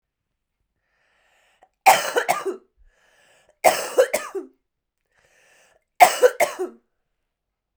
{"three_cough_length": "7.8 s", "three_cough_amplitude": 32768, "three_cough_signal_mean_std_ratio": 0.29, "survey_phase": "beta (2021-08-13 to 2022-03-07)", "age": "18-44", "gender": "Female", "wearing_mask": "No", "symptom_runny_or_blocked_nose": true, "symptom_fatigue": true, "smoker_status": "Never smoked", "respiratory_condition_asthma": true, "respiratory_condition_other": false, "recruitment_source": "Test and Trace", "submission_delay": "2 days", "covid_test_result": "Positive", "covid_test_method": "ePCR"}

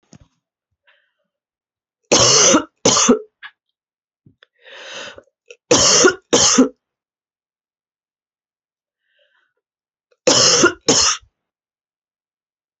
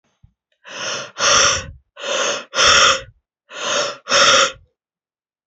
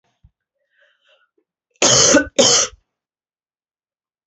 {"three_cough_length": "12.8 s", "three_cough_amplitude": 32768, "three_cough_signal_mean_std_ratio": 0.36, "exhalation_length": "5.5 s", "exhalation_amplitude": 32767, "exhalation_signal_mean_std_ratio": 0.52, "cough_length": "4.3 s", "cough_amplitude": 32767, "cough_signal_mean_std_ratio": 0.34, "survey_phase": "alpha (2021-03-01 to 2021-08-12)", "age": "45-64", "gender": "Female", "wearing_mask": "No", "symptom_cough_any": true, "symptom_new_continuous_cough": true, "symptom_diarrhoea": true, "symptom_fatigue": true, "symptom_headache": true, "symptom_onset": "4 days", "smoker_status": "Never smoked", "respiratory_condition_asthma": false, "respiratory_condition_other": false, "recruitment_source": "Test and Trace", "submission_delay": "2 days", "covid_test_result": "Positive", "covid_test_method": "RT-qPCR"}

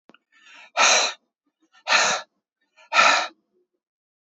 {"exhalation_length": "4.3 s", "exhalation_amplitude": 25630, "exhalation_signal_mean_std_ratio": 0.39, "survey_phase": "beta (2021-08-13 to 2022-03-07)", "age": "45-64", "gender": "Male", "wearing_mask": "No", "symptom_none": true, "smoker_status": "Never smoked", "respiratory_condition_asthma": false, "respiratory_condition_other": false, "recruitment_source": "REACT", "submission_delay": "22 days", "covid_test_result": "Negative", "covid_test_method": "RT-qPCR", "influenza_a_test_result": "Negative", "influenza_b_test_result": "Negative"}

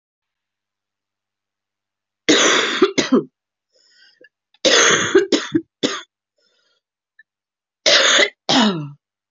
{"three_cough_length": "9.3 s", "three_cough_amplitude": 32767, "three_cough_signal_mean_std_ratio": 0.42, "survey_phase": "beta (2021-08-13 to 2022-03-07)", "age": "18-44", "gender": "Female", "wearing_mask": "No", "symptom_cough_any": true, "symptom_runny_or_blocked_nose": true, "symptom_sore_throat": true, "symptom_fatigue": true, "symptom_fever_high_temperature": true, "symptom_headache": true, "symptom_change_to_sense_of_smell_or_taste": true, "symptom_other": true, "symptom_onset": "3 days", "smoker_status": "Never smoked", "respiratory_condition_asthma": false, "respiratory_condition_other": false, "recruitment_source": "Test and Trace", "submission_delay": "1 day", "covid_test_result": "Positive", "covid_test_method": "RT-qPCR", "covid_ct_value": 22.0, "covid_ct_gene": "ORF1ab gene", "covid_ct_mean": 22.6, "covid_viral_load": "38000 copies/ml", "covid_viral_load_category": "Low viral load (10K-1M copies/ml)"}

